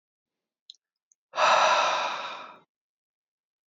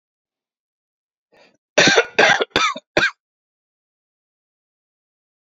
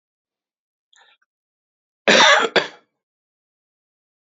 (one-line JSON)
{"exhalation_length": "3.7 s", "exhalation_amplitude": 11759, "exhalation_signal_mean_std_ratio": 0.41, "three_cough_length": "5.5 s", "three_cough_amplitude": 32163, "three_cough_signal_mean_std_ratio": 0.3, "cough_length": "4.3 s", "cough_amplitude": 32768, "cough_signal_mean_std_ratio": 0.27, "survey_phase": "alpha (2021-03-01 to 2021-08-12)", "age": "18-44", "gender": "Male", "wearing_mask": "No", "symptom_new_continuous_cough": true, "symptom_onset": "3 days", "smoker_status": "Current smoker (1 to 10 cigarettes per day)", "respiratory_condition_asthma": false, "respiratory_condition_other": false, "recruitment_source": "Test and Trace", "submission_delay": "1 day", "covid_test_result": "Positive", "covid_test_method": "RT-qPCR", "covid_ct_value": 16.3, "covid_ct_gene": "ORF1ab gene", "covid_ct_mean": 17.4, "covid_viral_load": "1900000 copies/ml", "covid_viral_load_category": "High viral load (>1M copies/ml)"}